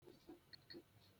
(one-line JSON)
{"three_cough_length": "1.2 s", "three_cough_amplitude": 194, "three_cough_signal_mean_std_ratio": 0.72, "survey_phase": "beta (2021-08-13 to 2022-03-07)", "age": "65+", "gender": "Male", "wearing_mask": "No", "symptom_none": true, "smoker_status": "Ex-smoker", "respiratory_condition_asthma": false, "respiratory_condition_other": false, "recruitment_source": "REACT", "submission_delay": "1 day", "covid_test_result": "Negative", "covid_test_method": "RT-qPCR"}